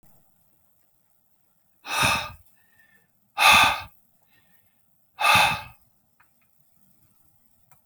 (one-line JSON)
{"exhalation_length": "7.9 s", "exhalation_amplitude": 24358, "exhalation_signal_mean_std_ratio": 0.3, "survey_phase": "beta (2021-08-13 to 2022-03-07)", "age": "45-64", "gender": "Male", "wearing_mask": "No", "symptom_none": true, "smoker_status": "Never smoked", "respiratory_condition_asthma": false, "respiratory_condition_other": false, "recruitment_source": "REACT", "submission_delay": "3 days", "covid_test_result": "Negative", "covid_test_method": "RT-qPCR"}